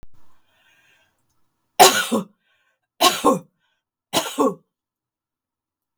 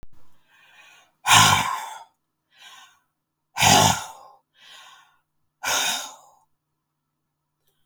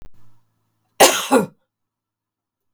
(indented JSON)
{
  "three_cough_length": "6.0 s",
  "three_cough_amplitude": 32768,
  "three_cough_signal_mean_std_ratio": 0.29,
  "exhalation_length": "7.9 s",
  "exhalation_amplitude": 32766,
  "exhalation_signal_mean_std_ratio": 0.33,
  "cough_length": "2.7 s",
  "cough_amplitude": 32768,
  "cough_signal_mean_std_ratio": 0.29,
  "survey_phase": "beta (2021-08-13 to 2022-03-07)",
  "age": "65+",
  "gender": "Female",
  "wearing_mask": "No",
  "symptom_none": true,
  "smoker_status": "Never smoked",
  "respiratory_condition_asthma": false,
  "respiratory_condition_other": false,
  "recruitment_source": "REACT",
  "submission_delay": "4 days",
  "covid_test_result": "Negative",
  "covid_test_method": "RT-qPCR",
  "influenza_a_test_result": "Negative",
  "influenza_b_test_result": "Negative"
}